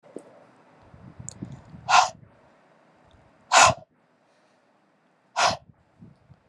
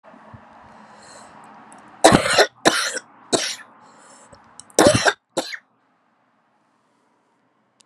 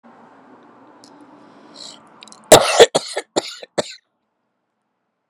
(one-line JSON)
{"exhalation_length": "6.5 s", "exhalation_amplitude": 25832, "exhalation_signal_mean_std_ratio": 0.26, "three_cough_length": "7.9 s", "three_cough_amplitude": 32768, "three_cough_signal_mean_std_ratio": 0.31, "cough_length": "5.3 s", "cough_amplitude": 32768, "cough_signal_mean_std_ratio": 0.24, "survey_phase": "beta (2021-08-13 to 2022-03-07)", "age": "18-44", "gender": "Female", "wearing_mask": "No", "symptom_cough_any": true, "symptom_new_continuous_cough": true, "symptom_runny_or_blocked_nose": true, "symptom_sore_throat": true, "symptom_abdominal_pain": true, "symptom_diarrhoea": true, "symptom_fatigue": true, "symptom_fever_high_temperature": true, "symptom_headache": true, "symptom_change_to_sense_of_smell_or_taste": true, "symptom_loss_of_taste": true, "symptom_onset": "3 days", "smoker_status": "Never smoked", "respiratory_condition_asthma": false, "respiratory_condition_other": false, "recruitment_source": "Test and Trace", "submission_delay": "2 days", "covid_test_result": "Positive", "covid_test_method": "RT-qPCR", "covid_ct_value": 12.8, "covid_ct_gene": "ORF1ab gene", "covid_ct_mean": 13.1, "covid_viral_load": "51000000 copies/ml", "covid_viral_load_category": "High viral load (>1M copies/ml)"}